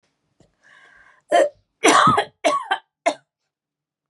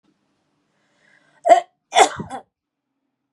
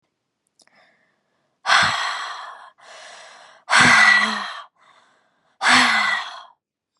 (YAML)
three_cough_length: 4.1 s
three_cough_amplitude: 30165
three_cough_signal_mean_std_ratio: 0.38
cough_length: 3.3 s
cough_amplitude: 32312
cough_signal_mean_std_ratio: 0.24
exhalation_length: 7.0 s
exhalation_amplitude: 29175
exhalation_signal_mean_std_ratio: 0.44
survey_phase: beta (2021-08-13 to 2022-03-07)
age: 18-44
gender: Female
wearing_mask: 'No'
symptom_headache: true
smoker_status: Never smoked
respiratory_condition_asthma: false
respiratory_condition_other: false
recruitment_source: REACT
submission_delay: 4 days
covid_test_result: Negative
covid_test_method: RT-qPCR
influenza_a_test_result: Unknown/Void
influenza_b_test_result: Unknown/Void